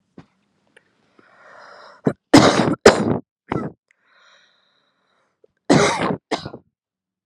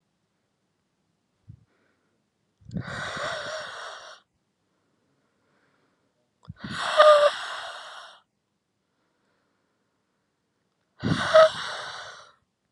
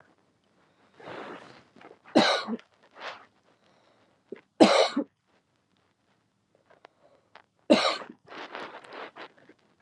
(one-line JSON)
{"cough_length": "7.3 s", "cough_amplitude": 32768, "cough_signal_mean_std_ratio": 0.31, "exhalation_length": "12.7 s", "exhalation_amplitude": 24771, "exhalation_signal_mean_std_ratio": 0.28, "three_cough_length": "9.8 s", "three_cough_amplitude": 26177, "three_cough_signal_mean_std_ratio": 0.27, "survey_phase": "beta (2021-08-13 to 2022-03-07)", "age": "18-44", "gender": "Female", "wearing_mask": "No", "symptom_none": true, "smoker_status": "Never smoked", "respiratory_condition_asthma": false, "respiratory_condition_other": false, "recruitment_source": "Test and Trace", "submission_delay": "1 day", "covid_test_result": "Positive", "covid_test_method": "LFT"}